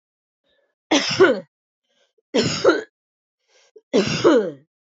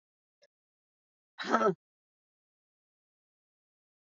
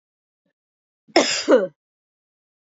{
  "three_cough_length": "4.9 s",
  "three_cough_amplitude": 25780,
  "three_cough_signal_mean_std_ratio": 0.41,
  "exhalation_length": "4.2 s",
  "exhalation_amplitude": 7770,
  "exhalation_signal_mean_std_ratio": 0.2,
  "cough_length": "2.7 s",
  "cough_amplitude": 28258,
  "cough_signal_mean_std_ratio": 0.3,
  "survey_phase": "alpha (2021-03-01 to 2021-08-12)",
  "age": "45-64",
  "gender": "Female",
  "wearing_mask": "No",
  "symptom_cough_any": true,
  "symptom_shortness_of_breath": true,
  "symptom_fatigue": true,
  "symptom_headache": true,
  "symptom_change_to_sense_of_smell_or_taste": true,
  "symptom_loss_of_taste": true,
  "symptom_onset": "7 days",
  "smoker_status": "Ex-smoker",
  "respiratory_condition_asthma": true,
  "respiratory_condition_other": false,
  "recruitment_source": "Test and Trace",
  "submission_delay": "2 days",
  "covid_test_result": "Positive",
  "covid_test_method": "RT-qPCR",
  "covid_ct_value": 17.1,
  "covid_ct_gene": "N gene",
  "covid_ct_mean": 17.6,
  "covid_viral_load": "1700000 copies/ml",
  "covid_viral_load_category": "High viral load (>1M copies/ml)"
}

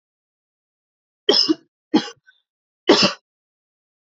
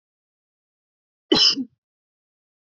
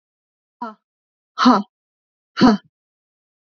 {
  "three_cough_length": "4.2 s",
  "three_cough_amplitude": 28252,
  "three_cough_signal_mean_std_ratio": 0.28,
  "cough_length": "2.6 s",
  "cough_amplitude": 21996,
  "cough_signal_mean_std_ratio": 0.26,
  "exhalation_length": "3.6 s",
  "exhalation_amplitude": 28453,
  "exhalation_signal_mean_std_ratio": 0.27,
  "survey_phase": "alpha (2021-03-01 to 2021-08-12)",
  "age": "18-44",
  "gender": "Female",
  "wearing_mask": "No",
  "symptom_none": true,
  "smoker_status": "Never smoked",
  "respiratory_condition_asthma": false,
  "respiratory_condition_other": false,
  "recruitment_source": "REACT",
  "submission_delay": "2 days",
  "covid_test_result": "Negative",
  "covid_test_method": "RT-qPCR"
}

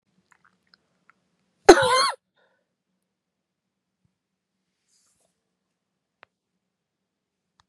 {
  "cough_length": "7.7 s",
  "cough_amplitude": 32768,
  "cough_signal_mean_std_ratio": 0.15,
  "survey_phase": "beta (2021-08-13 to 2022-03-07)",
  "age": "45-64",
  "gender": "Female",
  "wearing_mask": "No",
  "symptom_cough_any": true,
  "symptom_runny_or_blocked_nose": true,
  "symptom_shortness_of_breath": true,
  "symptom_sore_throat": true,
  "symptom_fatigue": true,
  "symptom_fever_high_temperature": true,
  "symptom_headache": true,
  "symptom_onset": "7 days",
  "smoker_status": "Never smoked",
  "respiratory_condition_asthma": true,
  "respiratory_condition_other": false,
  "recruitment_source": "Test and Trace",
  "submission_delay": "1 day",
  "covid_test_result": "Positive",
  "covid_test_method": "ePCR"
}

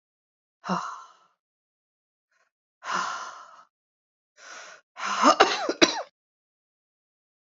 {
  "exhalation_length": "7.4 s",
  "exhalation_amplitude": 27070,
  "exhalation_signal_mean_std_ratio": 0.29,
  "survey_phase": "beta (2021-08-13 to 2022-03-07)",
  "age": "18-44",
  "gender": "Female",
  "wearing_mask": "No",
  "symptom_cough_any": true,
  "symptom_new_continuous_cough": true,
  "symptom_runny_or_blocked_nose": true,
  "symptom_fatigue": true,
  "symptom_change_to_sense_of_smell_or_taste": true,
  "symptom_other": true,
  "symptom_onset": "8 days",
  "smoker_status": "Never smoked",
  "respiratory_condition_asthma": false,
  "respiratory_condition_other": false,
  "recruitment_source": "Test and Trace",
  "submission_delay": "4 days",
  "covid_test_result": "Negative",
  "covid_test_method": "RT-qPCR"
}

